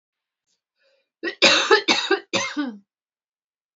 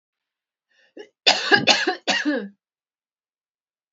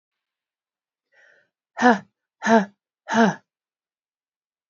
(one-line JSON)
{"three_cough_length": "3.8 s", "three_cough_amplitude": 27954, "three_cough_signal_mean_std_ratio": 0.39, "cough_length": "3.9 s", "cough_amplitude": 32099, "cough_signal_mean_std_ratio": 0.36, "exhalation_length": "4.7 s", "exhalation_amplitude": 27349, "exhalation_signal_mean_std_ratio": 0.27, "survey_phase": "beta (2021-08-13 to 2022-03-07)", "age": "45-64", "gender": "Female", "wearing_mask": "No", "symptom_cough_any": true, "symptom_runny_or_blocked_nose": true, "symptom_shortness_of_breath": true, "symptom_fatigue": true, "symptom_headache": true, "symptom_change_to_sense_of_smell_or_taste": true, "symptom_loss_of_taste": true, "symptom_other": true, "symptom_onset": "4 days", "smoker_status": "Never smoked", "respiratory_condition_asthma": false, "respiratory_condition_other": false, "recruitment_source": "Test and Trace", "submission_delay": "2 days", "covid_test_result": "Positive", "covid_test_method": "RT-qPCR"}